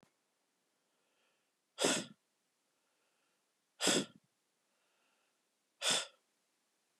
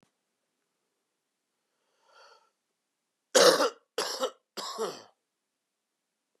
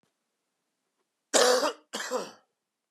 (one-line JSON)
{"exhalation_length": "7.0 s", "exhalation_amplitude": 5623, "exhalation_signal_mean_std_ratio": 0.25, "three_cough_length": "6.4 s", "three_cough_amplitude": 17227, "three_cough_signal_mean_std_ratio": 0.25, "cough_length": "2.9 s", "cough_amplitude": 14913, "cough_signal_mean_std_ratio": 0.35, "survey_phase": "beta (2021-08-13 to 2022-03-07)", "age": "18-44", "gender": "Male", "wearing_mask": "No", "symptom_cough_any": true, "symptom_runny_or_blocked_nose": true, "symptom_sore_throat": true, "symptom_fatigue": true, "symptom_headache": true, "symptom_change_to_sense_of_smell_or_taste": true, "symptom_loss_of_taste": true, "symptom_onset": "5 days", "smoker_status": "Never smoked", "respiratory_condition_asthma": true, "respiratory_condition_other": false, "recruitment_source": "REACT", "submission_delay": "2 days", "covid_test_result": "Negative", "covid_test_method": "RT-qPCR", "influenza_a_test_result": "Negative", "influenza_b_test_result": "Negative"}